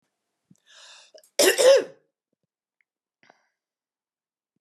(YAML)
cough_length: 4.6 s
cough_amplitude: 19106
cough_signal_mean_std_ratio: 0.25
survey_phase: beta (2021-08-13 to 2022-03-07)
age: 45-64
gender: Female
wearing_mask: 'No'
symptom_fatigue: true
smoker_status: Never smoked
respiratory_condition_asthma: false
respiratory_condition_other: false
recruitment_source: REACT
submission_delay: 3 days
covid_test_result: Negative
covid_test_method: RT-qPCR